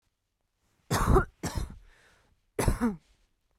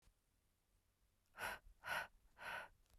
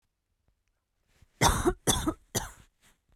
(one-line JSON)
{"three_cough_length": "3.6 s", "three_cough_amplitude": 10317, "three_cough_signal_mean_std_ratio": 0.38, "exhalation_length": "3.0 s", "exhalation_amplitude": 828, "exhalation_signal_mean_std_ratio": 0.43, "cough_length": "3.2 s", "cough_amplitude": 13584, "cough_signal_mean_std_ratio": 0.35, "survey_phase": "beta (2021-08-13 to 2022-03-07)", "age": "18-44", "gender": "Female", "wearing_mask": "No", "symptom_none": true, "smoker_status": "Current smoker (1 to 10 cigarettes per day)", "respiratory_condition_asthma": false, "respiratory_condition_other": false, "recruitment_source": "REACT", "submission_delay": "3 days", "covid_test_result": "Negative", "covid_test_method": "RT-qPCR", "influenza_a_test_result": "Negative", "influenza_b_test_result": "Negative"}